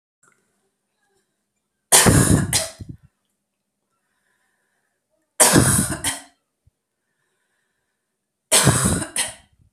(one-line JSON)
{"three_cough_length": "9.7 s", "three_cough_amplitude": 32768, "three_cough_signal_mean_std_ratio": 0.35, "survey_phase": "alpha (2021-03-01 to 2021-08-12)", "age": "18-44", "gender": "Female", "wearing_mask": "No", "symptom_none": true, "symptom_onset": "12 days", "smoker_status": "Never smoked", "respiratory_condition_asthma": false, "respiratory_condition_other": false, "recruitment_source": "REACT", "submission_delay": "1 day", "covid_test_result": "Negative", "covid_test_method": "RT-qPCR"}